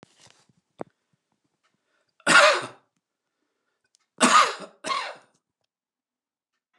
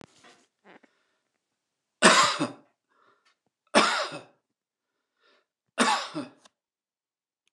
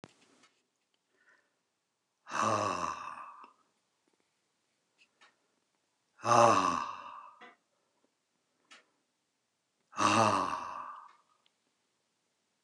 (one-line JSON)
{"cough_length": "6.8 s", "cough_amplitude": 26198, "cough_signal_mean_std_ratio": 0.27, "three_cough_length": "7.5 s", "three_cough_amplitude": 23813, "three_cough_signal_mean_std_ratio": 0.28, "exhalation_length": "12.6 s", "exhalation_amplitude": 11986, "exhalation_signal_mean_std_ratio": 0.31, "survey_phase": "beta (2021-08-13 to 2022-03-07)", "age": "65+", "gender": "Male", "wearing_mask": "No", "symptom_none": true, "symptom_onset": "6 days", "smoker_status": "Never smoked", "respiratory_condition_asthma": false, "respiratory_condition_other": false, "recruitment_source": "REACT", "submission_delay": "2 days", "covid_test_result": "Negative", "covid_test_method": "RT-qPCR", "influenza_a_test_result": "Negative", "influenza_b_test_result": "Negative"}